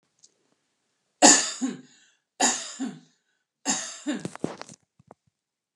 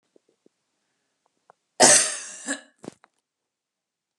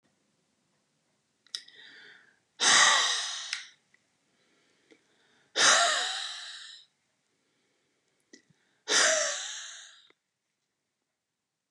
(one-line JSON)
{"three_cough_length": "5.8 s", "three_cough_amplitude": 30624, "three_cough_signal_mean_std_ratio": 0.3, "cough_length": "4.2 s", "cough_amplitude": 31939, "cough_signal_mean_std_ratio": 0.24, "exhalation_length": "11.7 s", "exhalation_amplitude": 12511, "exhalation_signal_mean_std_ratio": 0.34, "survey_phase": "beta (2021-08-13 to 2022-03-07)", "age": "65+", "gender": "Female", "wearing_mask": "No", "symptom_none": true, "smoker_status": "Ex-smoker", "respiratory_condition_asthma": false, "respiratory_condition_other": false, "recruitment_source": "REACT", "submission_delay": "2 days", "covid_test_result": "Negative", "covid_test_method": "RT-qPCR", "influenza_a_test_result": "Negative", "influenza_b_test_result": "Negative"}